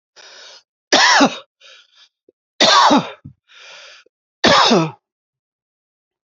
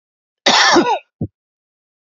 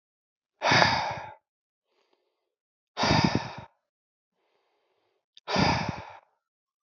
{"three_cough_length": "6.4 s", "three_cough_amplitude": 32767, "three_cough_signal_mean_std_ratio": 0.39, "cough_length": "2.0 s", "cough_amplitude": 32768, "cough_signal_mean_std_ratio": 0.44, "exhalation_length": "6.8 s", "exhalation_amplitude": 25525, "exhalation_signal_mean_std_ratio": 0.37, "survey_phase": "beta (2021-08-13 to 2022-03-07)", "age": "45-64", "gender": "Male", "wearing_mask": "No", "symptom_runny_or_blocked_nose": true, "symptom_fatigue": true, "smoker_status": "Never smoked", "respiratory_condition_asthma": false, "respiratory_condition_other": false, "recruitment_source": "Test and Trace", "submission_delay": "1 day", "covid_test_result": "Positive", "covid_test_method": "RT-qPCR", "covid_ct_value": 18.0, "covid_ct_gene": "ORF1ab gene"}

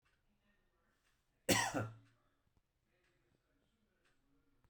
{"cough_length": "4.7 s", "cough_amplitude": 3988, "cough_signal_mean_std_ratio": 0.23, "survey_phase": "beta (2021-08-13 to 2022-03-07)", "age": "45-64", "gender": "Male", "wearing_mask": "No", "symptom_none": true, "smoker_status": "Never smoked", "respiratory_condition_asthma": false, "respiratory_condition_other": false, "recruitment_source": "REACT", "submission_delay": "5 days", "covid_test_result": "Negative", "covid_test_method": "RT-qPCR"}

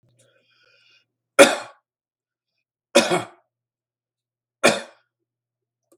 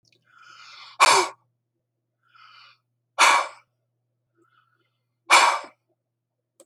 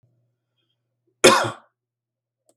{"three_cough_length": "6.0 s", "three_cough_amplitude": 32768, "three_cough_signal_mean_std_ratio": 0.21, "exhalation_length": "6.7 s", "exhalation_amplitude": 25957, "exhalation_signal_mean_std_ratio": 0.28, "cough_length": "2.6 s", "cough_amplitude": 32768, "cough_signal_mean_std_ratio": 0.22, "survey_phase": "beta (2021-08-13 to 2022-03-07)", "age": "65+", "gender": "Male", "wearing_mask": "No", "symptom_none": true, "smoker_status": "Ex-smoker", "respiratory_condition_asthma": false, "respiratory_condition_other": false, "recruitment_source": "REACT", "submission_delay": "3 days", "covid_test_result": "Negative", "covid_test_method": "RT-qPCR", "influenza_a_test_result": "Negative", "influenza_b_test_result": "Negative"}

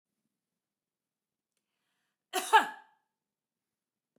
{"cough_length": "4.2 s", "cough_amplitude": 11171, "cough_signal_mean_std_ratio": 0.17, "survey_phase": "beta (2021-08-13 to 2022-03-07)", "age": "45-64", "gender": "Female", "wearing_mask": "No", "symptom_none": true, "smoker_status": "Never smoked", "respiratory_condition_asthma": false, "respiratory_condition_other": false, "recruitment_source": "REACT", "submission_delay": "1 day", "covid_test_result": "Negative", "covid_test_method": "RT-qPCR"}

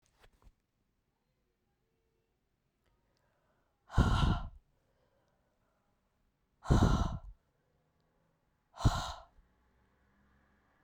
{"exhalation_length": "10.8 s", "exhalation_amplitude": 7695, "exhalation_signal_mean_std_ratio": 0.26, "survey_phase": "beta (2021-08-13 to 2022-03-07)", "age": "45-64", "gender": "Female", "wearing_mask": "No", "symptom_cough_any": true, "symptom_new_continuous_cough": true, "symptom_runny_or_blocked_nose": true, "symptom_shortness_of_breath": true, "symptom_sore_throat": true, "symptom_fatigue": true, "symptom_headache": true, "symptom_change_to_sense_of_smell_or_taste": true, "symptom_other": true, "smoker_status": "Never smoked", "respiratory_condition_asthma": false, "respiratory_condition_other": false, "recruitment_source": "Test and Trace", "submission_delay": "2 days", "covid_test_result": "Positive", "covid_test_method": "RT-qPCR", "covid_ct_value": 12.2, "covid_ct_gene": "N gene", "covid_ct_mean": 13.2, "covid_viral_load": "47000000 copies/ml", "covid_viral_load_category": "High viral load (>1M copies/ml)"}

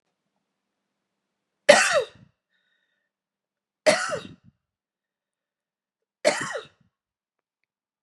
{"three_cough_length": "8.0 s", "three_cough_amplitude": 31624, "three_cough_signal_mean_std_ratio": 0.23, "survey_phase": "beta (2021-08-13 to 2022-03-07)", "age": "45-64", "gender": "Female", "wearing_mask": "No", "symptom_cough_any": true, "symptom_runny_or_blocked_nose": true, "symptom_shortness_of_breath": true, "symptom_sore_throat": true, "symptom_fatigue": true, "symptom_headache": true, "symptom_change_to_sense_of_smell_or_taste": true, "symptom_loss_of_taste": true, "symptom_other": true, "symptom_onset": "3 days", "smoker_status": "Ex-smoker", "respiratory_condition_asthma": true, "respiratory_condition_other": false, "recruitment_source": "Test and Trace", "submission_delay": "2 days", "covid_test_result": "Positive", "covid_test_method": "RT-qPCR", "covid_ct_value": 26.4, "covid_ct_gene": "ORF1ab gene"}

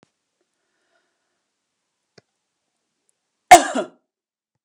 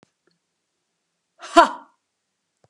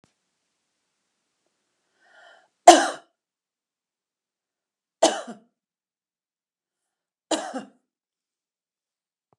{"cough_length": "4.6 s", "cough_amplitude": 32768, "cough_signal_mean_std_ratio": 0.14, "exhalation_length": "2.7 s", "exhalation_amplitude": 32767, "exhalation_signal_mean_std_ratio": 0.17, "three_cough_length": "9.4 s", "three_cough_amplitude": 32768, "three_cough_signal_mean_std_ratio": 0.14, "survey_phase": "beta (2021-08-13 to 2022-03-07)", "age": "65+", "gender": "Female", "wearing_mask": "No", "symptom_none": true, "smoker_status": "Never smoked", "respiratory_condition_asthma": false, "respiratory_condition_other": false, "recruitment_source": "REACT", "submission_delay": "1 day", "covid_test_result": "Negative", "covid_test_method": "RT-qPCR"}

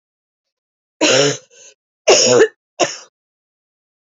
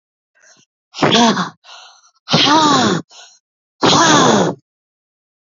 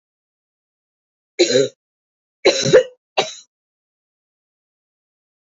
{"three_cough_length": "4.0 s", "three_cough_amplitude": 30110, "three_cough_signal_mean_std_ratio": 0.38, "exhalation_length": "5.5 s", "exhalation_amplitude": 31304, "exhalation_signal_mean_std_ratio": 0.51, "cough_length": "5.5 s", "cough_amplitude": 29499, "cough_signal_mean_std_ratio": 0.27, "survey_phase": "beta (2021-08-13 to 2022-03-07)", "age": "45-64", "gender": "Female", "wearing_mask": "No", "symptom_cough_any": true, "symptom_runny_or_blocked_nose": true, "symptom_shortness_of_breath": true, "symptom_sore_throat": true, "symptom_abdominal_pain": true, "symptom_fatigue": true, "symptom_fever_high_temperature": true, "symptom_headache": true, "symptom_change_to_sense_of_smell_or_taste": true, "symptom_loss_of_taste": true, "symptom_other": true, "symptom_onset": "4 days", "smoker_status": "Never smoked", "respiratory_condition_asthma": true, "respiratory_condition_other": false, "recruitment_source": "Test and Trace", "submission_delay": "2 days", "covid_test_result": "Positive", "covid_test_method": "RT-qPCR", "covid_ct_value": 19.7, "covid_ct_gene": "ORF1ab gene", "covid_ct_mean": 20.2, "covid_viral_load": "240000 copies/ml", "covid_viral_load_category": "Low viral load (10K-1M copies/ml)"}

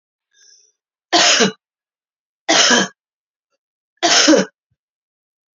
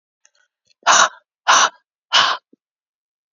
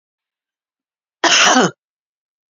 {"three_cough_length": "5.5 s", "three_cough_amplitude": 32767, "three_cough_signal_mean_std_ratio": 0.38, "exhalation_length": "3.3 s", "exhalation_amplitude": 32768, "exhalation_signal_mean_std_ratio": 0.36, "cough_length": "2.6 s", "cough_amplitude": 31695, "cough_signal_mean_std_ratio": 0.35, "survey_phase": "beta (2021-08-13 to 2022-03-07)", "age": "45-64", "gender": "Female", "wearing_mask": "No", "symptom_cough_any": true, "symptom_runny_or_blocked_nose": true, "symptom_sore_throat": true, "symptom_fatigue": true, "symptom_fever_high_temperature": true, "symptom_headache": true, "symptom_change_to_sense_of_smell_or_taste": true, "symptom_loss_of_taste": true, "smoker_status": "Ex-smoker", "respiratory_condition_asthma": false, "respiratory_condition_other": false, "recruitment_source": "Test and Trace", "submission_delay": "2 days", "covid_test_result": "Positive", "covid_test_method": "RT-qPCR"}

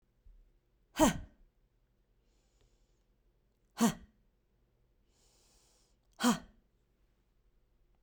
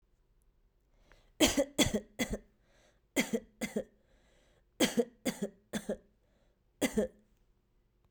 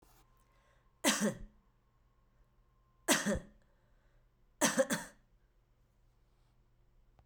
{"exhalation_length": "8.0 s", "exhalation_amplitude": 6579, "exhalation_signal_mean_std_ratio": 0.21, "cough_length": "8.1 s", "cough_amplitude": 10337, "cough_signal_mean_std_ratio": 0.34, "three_cough_length": "7.3 s", "three_cough_amplitude": 8607, "three_cough_signal_mean_std_ratio": 0.3, "survey_phase": "beta (2021-08-13 to 2022-03-07)", "age": "45-64", "gender": "Female", "wearing_mask": "No", "symptom_none": true, "smoker_status": "Never smoked", "respiratory_condition_asthma": true, "respiratory_condition_other": true, "recruitment_source": "REACT", "submission_delay": "1 day", "covid_test_result": "Negative", "covid_test_method": "RT-qPCR"}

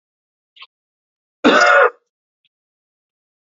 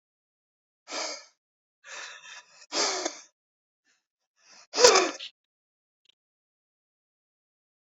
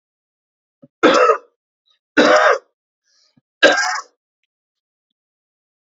{"cough_length": "3.6 s", "cough_amplitude": 28542, "cough_signal_mean_std_ratio": 0.3, "exhalation_length": "7.9 s", "exhalation_amplitude": 27480, "exhalation_signal_mean_std_ratio": 0.24, "three_cough_length": "6.0 s", "three_cough_amplitude": 32768, "three_cough_signal_mean_std_ratio": 0.34, "survey_phase": "beta (2021-08-13 to 2022-03-07)", "age": "45-64", "gender": "Male", "wearing_mask": "No", "symptom_none": true, "smoker_status": "Ex-smoker", "respiratory_condition_asthma": false, "respiratory_condition_other": false, "recruitment_source": "REACT", "submission_delay": "2 days", "covid_test_result": "Negative", "covid_test_method": "RT-qPCR", "influenza_a_test_result": "Unknown/Void", "influenza_b_test_result": "Unknown/Void"}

